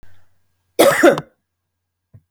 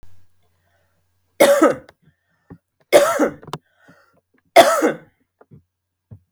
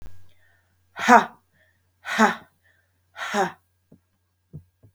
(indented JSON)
{
  "cough_length": "2.3 s",
  "cough_amplitude": 32768,
  "cough_signal_mean_std_ratio": 0.33,
  "three_cough_length": "6.3 s",
  "three_cough_amplitude": 32768,
  "three_cough_signal_mean_std_ratio": 0.32,
  "exhalation_length": "4.9 s",
  "exhalation_amplitude": 30704,
  "exhalation_signal_mean_std_ratio": 0.28,
  "survey_phase": "beta (2021-08-13 to 2022-03-07)",
  "age": "45-64",
  "gender": "Female",
  "wearing_mask": "No",
  "symptom_none": true,
  "smoker_status": "Current smoker (1 to 10 cigarettes per day)",
  "respiratory_condition_asthma": false,
  "respiratory_condition_other": false,
  "recruitment_source": "REACT",
  "submission_delay": "2 days",
  "covid_test_result": "Negative",
  "covid_test_method": "RT-qPCR"
}